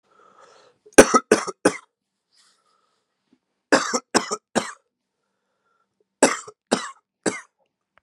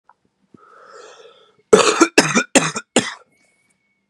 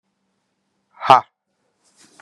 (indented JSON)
{
  "three_cough_length": "8.0 s",
  "three_cough_amplitude": 32768,
  "three_cough_signal_mean_std_ratio": 0.24,
  "cough_length": "4.1 s",
  "cough_amplitude": 32768,
  "cough_signal_mean_std_ratio": 0.33,
  "exhalation_length": "2.2 s",
  "exhalation_amplitude": 32768,
  "exhalation_signal_mean_std_ratio": 0.18,
  "survey_phase": "beta (2021-08-13 to 2022-03-07)",
  "age": "18-44",
  "gender": "Male",
  "wearing_mask": "No",
  "symptom_cough_any": true,
  "symptom_new_continuous_cough": true,
  "symptom_runny_or_blocked_nose": true,
  "symptom_shortness_of_breath": true,
  "symptom_sore_throat": true,
  "symptom_fever_high_temperature": true,
  "symptom_headache": true,
  "symptom_onset": "3 days",
  "smoker_status": "Current smoker (11 or more cigarettes per day)",
  "respiratory_condition_asthma": false,
  "respiratory_condition_other": false,
  "recruitment_source": "Test and Trace",
  "submission_delay": "2 days",
  "covid_test_result": "Positive",
  "covid_test_method": "RT-qPCR"
}